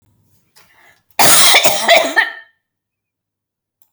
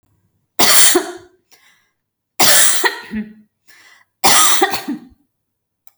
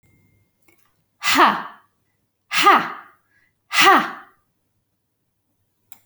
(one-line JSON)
{"cough_length": "3.9 s", "cough_amplitude": 32768, "cough_signal_mean_std_ratio": 0.42, "three_cough_length": "6.0 s", "three_cough_amplitude": 32768, "three_cough_signal_mean_std_ratio": 0.44, "exhalation_length": "6.1 s", "exhalation_amplitude": 30313, "exhalation_signal_mean_std_ratio": 0.33, "survey_phase": "beta (2021-08-13 to 2022-03-07)", "age": "45-64", "gender": "Female", "wearing_mask": "No", "symptom_none": true, "smoker_status": "Never smoked", "respiratory_condition_asthma": false, "respiratory_condition_other": false, "recruitment_source": "REACT", "submission_delay": "2 days", "covid_test_result": "Negative", "covid_test_method": "RT-qPCR"}